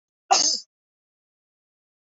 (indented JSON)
{
  "cough_length": "2.0 s",
  "cough_amplitude": 19031,
  "cough_signal_mean_std_ratio": 0.28,
  "survey_phase": "alpha (2021-03-01 to 2021-08-12)",
  "age": "45-64",
  "gender": "Female",
  "wearing_mask": "No",
  "symptom_none": true,
  "smoker_status": "Never smoked",
  "respiratory_condition_asthma": false,
  "respiratory_condition_other": false,
  "recruitment_source": "REACT",
  "submission_delay": "4 days",
  "covid_test_result": "Negative",
  "covid_test_method": "RT-qPCR"
}